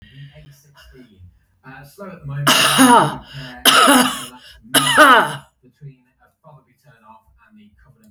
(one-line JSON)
{"exhalation_length": "8.1 s", "exhalation_amplitude": 32768, "exhalation_signal_mean_std_ratio": 0.42, "survey_phase": "beta (2021-08-13 to 2022-03-07)", "age": "65+", "gender": "Female", "wearing_mask": "No", "symptom_cough_any": true, "symptom_runny_or_blocked_nose": true, "symptom_sore_throat": true, "symptom_onset": "10 days", "smoker_status": "Never smoked", "respiratory_condition_asthma": false, "respiratory_condition_other": false, "recruitment_source": "REACT", "submission_delay": "2 days", "covid_test_result": "Negative", "covid_test_method": "RT-qPCR"}